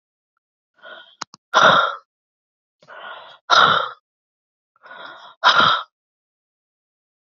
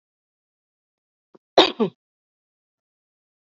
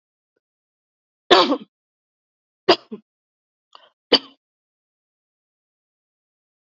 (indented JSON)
{
  "exhalation_length": "7.3 s",
  "exhalation_amplitude": 30824,
  "exhalation_signal_mean_std_ratio": 0.33,
  "cough_length": "3.5 s",
  "cough_amplitude": 30890,
  "cough_signal_mean_std_ratio": 0.17,
  "three_cough_length": "6.7 s",
  "three_cough_amplitude": 28783,
  "three_cough_signal_mean_std_ratio": 0.18,
  "survey_phase": "beta (2021-08-13 to 2022-03-07)",
  "age": "45-64",
  "gender": "Female",
  "wearing_mask": "No",
  "symptom_headache": true,
  "smoker_status": "Never smoked",
  "respiratory_condition_asthma": false,
  "respiratory_condition_other": false,
  "recruitment_source": "REACT",
  "submission_delay": "1 day",
  "covid_test_result": "Negative",
  "covid_test_method": "RT-qPCR",
  "influenza_a_test_result": "Negative",
  "influenza_b_test_result": "Negative"
}